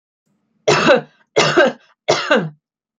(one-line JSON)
{"three_cough_length": "3.0 s", "three_cough_amplitude": 32159, "three_cough_signal_mean_std_ratio": 0.48, "survey_phase": "beta (2021-08-13 to 2022-03-07)", "age": "45-64", "gender": "Female", "wearing_mask": "No", "symptom_none": true, "smoker_status": "Never smoked", "respiratory_condition_asthma": false, "respiratory_condition_other": false, "recruitment_source": "REACT", "submission_delay": "2 days", "covid_test_result": "Negative", "covid_test_method": "RT-qPCR", "influenza_a_test_result": "Negative", "influenza_b_test_result": "Negative"}